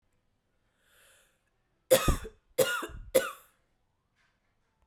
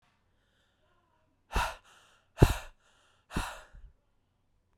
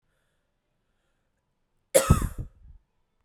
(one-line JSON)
{"three_cough_length": "4.9 s", "three_cough_amplitude": 12750, "three_cough_signal_mean_std_ratio": 0.28, "exhalation_length": "4.8 s", "exhalation_amplitude": 18987, "exhalation_signal_mean_std_ratio": 0.21, "cough_length": "3.2 s", "cough_amplitude": 19089, "cough_signal_mean_std_ratio": 0.23, "survey_phase": "beta (2021-08-13 to 2022-03-07)", "age": "18-44", "gender": "Female", "wearing_mask": "No", "symptom_runny_or_blocked_nose": true, "symptom_sore_throat": true, "symptom_diarrhoea": true, "symptom_fatigue": true, "symptom_headache": true, "symptom_onset": "3 days", "smoker_status": "Never smoked", "respiratory_condition_asthma": true, "respiratory_condition_other": false, "recruitment_source": "Test and Trace", "submission_delay": "2 days", "covid_test_result": "Positive", "covid_test_method": "RT-qPCR"}